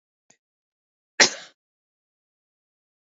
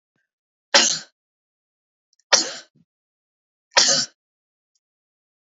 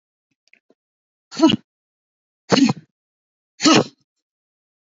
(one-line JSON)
{"cough_length": "3.2 s", "cough_amplitude": 32767, "cough_signal_mean_std_ratio": 0.13, "three_cough_length": "5.5 s", "three_cough_amplitude": 32767, "three_cough_signal_mean_std_ratio": 0.26, "exhalation_length": "4.9 s", "exhalation_amplitude": 28352, "exhalation_signal_mean_std_ratio": 0.28, "survey_phase": "beta (2021-08-13 to 2022-03-07)", "age": "45-64", "gender": "Female", "wearing_mask": "No", "symptom_none": true, "smoker_status": "Never smoked", "respiratory_condition_asthma": false, "respiratory_condition_other": false, "recruitment_source": "REACT", "submission_delay": "2 days", "covid_test_result": "Negative", "covid_test_method": "RT-qPCR", "influenza_a_test_result": "Unknown/Void", "influenza_b_test_result": "Unknown/Void"}